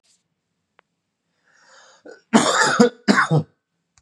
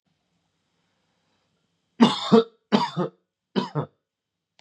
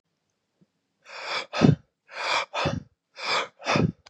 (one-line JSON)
{"cough_length": "4.0 s", "cough_amplitude": 32767, "cough_signal_mean_std_ratio": 0.37, "three_cough_length": "4.6 s", "three_cough_amplitude": 26264, "three_cough_signal_mean_std_ratio": 0.29, "exhalation_length": "4.1 s", "exhalation_amplitude": 24007, "exhalation_signal_mean_std_ratio": 0.44, "survey_phase": "beta (2021-08-13 to 2022-03-07)", "age": "18-44", "gender": "Male", "wearing_mask": "No", "symptom_sore_throat": true, "symptom_fatigue": true, "symptom_fever_high_temperature": true, "smoker_status": "Never smoked", "respiratory_condition_asthma": false, "respiratory_condition_other": false, "recruitment_source": "Test and Trace", "submission_delay": "2 days", "covid_test_result": "Positive", "covid_test_method": "RT-qPCR"}